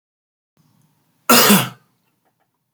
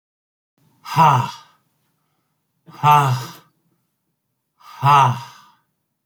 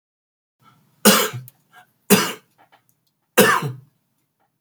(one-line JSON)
{"cough_length": "2.7 s", "cough_amplitude": 32768, "cough_signal_mean_std_ratio": 0.3, "exhalation_length": "6.1 s", "exhalation_amplitude": 27885, "exhalation_signal_mean_std_ratio": 0.35, "three_cough_length": "4.6 s", "three_cough_amplitude": 32768, "three_cough_signal_mean_std_ratio": 0.31, "survey_phase": "beta (2021-08-13 to 2022-03-07)", "age": "65+", "gender": "Male", "wearing_mask": "No", "symptom_cough_any": true, "symptom_runny_or_blocked_nose": true, "symptom_fatigue": true, "symptom_change_to_sense_of_smell_or_taste": true, "smoker_status": "Never smoked", "respiratory_condition_asthma": false, "respiratory_condition_other": false, "recruitment_source": "Test and Trace", "submission_delay": "2 days", "covid_test_result": "Positive", "covid_test_method": "LFT"}